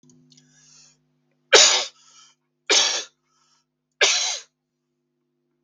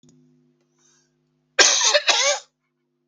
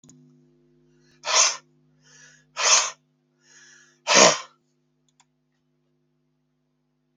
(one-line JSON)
{"three_cough_length": "5.6 s", "three_cough_amplitude": 32768, "three_cough_signal_mean_std_ratio": 0.31, "cough_length": "3.1 s", "cough_amplitude": 32768, "cough_signal_mean_std_ratio": 0.39, "exhalation_length": "7.2 s", "exhalation_amplitude": 32768, "exhalation_signal_mean_std_ratio": 0.27, "survey_phase": "beta (2021-08-13 to 2022-03-07)", "age": "45-64", "gender": "Male", "wearing_mask": "No", "symptom_none": true, "symptom_onset": "12 days", "smoker_status": "Ex-smoker", "respiratory_condition_asthma": false, "respiratory_condition_other": false, "recruitment_source": "REACT", "submission_delay": "21 days", "covid_test_result": "Negative", "covid_test_method": "RT-qPCR"}